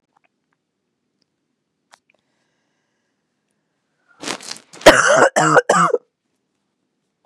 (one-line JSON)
{"cough_length": "7.3 s", "cough_amplitude": 32768, "cough_signal_mean_std_ratio": 0.28, "survey_phase": "beta (2021-08-13 to 2022-03-07)", "age": "45-64", "gender": "Female", "wearing_mask": "No", "symptom_cough_any": true, "symptom_new_continuous_cough": true, "symptom_runny_or_blocked_nose": true, "symptom_shortness_of_breath": true, "symptom_sore_throat": true, "symptom_fatigue": true, "symptom_fever_high_temperature": true, "symptom_headache": true, "symptom_onset": "2 days", "smoker_status": "Never smoked", "respiratory_condition_asthma": false, "respiratory_condition_other": false, "recruitment_source": "Test and Trace", "submission_delay": "1 day", "covid_test_result": "Positive", "covid_test_method": "ePCR"}